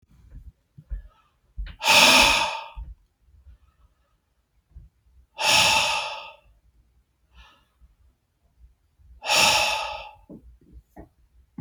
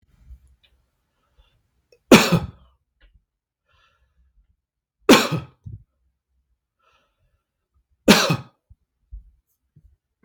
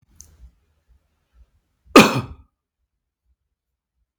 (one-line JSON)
{"exhalation_length": "11.6 s", "exhalation_amplitude": 24251, "exhalation_signal_mean_std_ratio": 0.36, "three_cough_length": "10.2 s", "three_cough_amplitude": 32768, "three_cough_signal_mean_std_ratio": 0.21, "cough_length": "4.2 s", "cough_amplitude": 32768, "cough_signal_mean_std_ratio": 0.17, "survey_phase": "beta (2021-08-13 to 2022-03-07)", "age": "45-64", "gender": "Male", "wearing_mask": "No", "symptom_none": true, "smoker_status": "Ex-smoker", "respiratory_condition_asthma": false, "respiratory_condition_other": false, "recruitment_source": "REACT", "submission_delay": "1 day", "covid_test_result": "Negative", "covid_test_method": "RT-qPCR"}